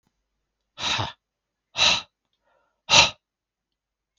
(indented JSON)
{
  "exhalation_length": "4.2 s",
  "exhalation_amplitude": 32724,
  "exhalation_signal_mean_std_ratio": 0.29,
  "survey_phase": "beta (2021-08-13 to 2022-03-07)",
  "age": "45-64",
  "gender": "Male",
  "wearing_mask": "No",
  "symptom_none": true,
  "smoker_status": "Never smoked",
  "respiratory_condition_asthma": false,
  "respiratory_condition_other": false,
  "recruitment_source": "Test and Trace",
  "submission_delay": "0 days",
  "covid_test_result": "Negative",
  "covid_test_method": "LFT"
}